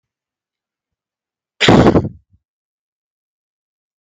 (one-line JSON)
{"cough_length": "4.0 s", "cough_amplitude": 32768, "cough_signal_mean_std_ratio": 0.26, "survey_phase": "beta (2021-08-13 to 2022-03-07)", "age": "65+", "gender": "Male", "wearing_mask": "No", "symptom_cough_any": true, "symptom_sore_throat": true, "symptom_onset": "3 days", "smoker_status": "Ex-smoker", "respiratory_condition_asthma": false, "respiratory_condition_other": false, "recruitment_source": "Test and Trace", "submission_delay": "2 days", "covid_test_result": "Positive", "covid_test_method": "RT-qPCR", "covid_ct_value": 23.1, "covid_ct_gene": "ORF1ab gene"}